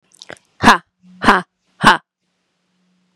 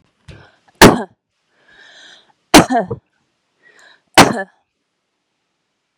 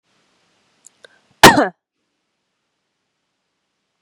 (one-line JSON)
{"exhalation_length": "3.2 s", "exhalation_amplitude": 32768, "exhalation_signal_mean_std_ratio": 0.28, "three_cough_length": "6.0 s", "three_cough_amplitude": 32768, "three_cough_signal_mean_std_ratio": 0.25, "cough_length": "4.0 s", "cough_amplitude": 32768, "cough_signal_mean_std_ratio": 0.18, "survey_phase": "beta (2021-08-13 to 2022-03-07)", "age": "45-64", "gender": "Female", "wearing_mask": "No", "symptom_cough_any": true, "symptom_runny_or_blocked_nose": true, "symptom_sore_throat": true, "symptom_fatigue": true, "symptom_headache": true, "symptom_change_to_sense_of_smell_or_taste": true, "symptom_onset": "3 days", "smoker_status": "Ex-smoker", "respiratory_condition_asthma": false, "respiratory_condition_other": false, "recruitment_source": "Test and Trace", "submission_delay": "2 days", "covid_test_result": "Positive", "covid_test_method": "RT-qPCR"}